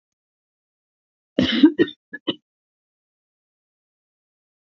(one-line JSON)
{"cough_length": "4.6 s", "cough_amplitude": 26015, "cough_signal_mean_std_ratio": 0.22, "survey_phase": "beta (2021-08-13 to 2022-03-07)", "age": "65+", "gender": "Female", "wearing_mask": "No", "symptom_none": true, "smoker_status": "Never smoked", "respiratory_condition_asthma": false, "respiratory_condition_other": false, "recruitment_source": "REACT", "submission_delay": "1 day", "covid_test_result": "Negative", "covid_test_method": "RT-qPCR"}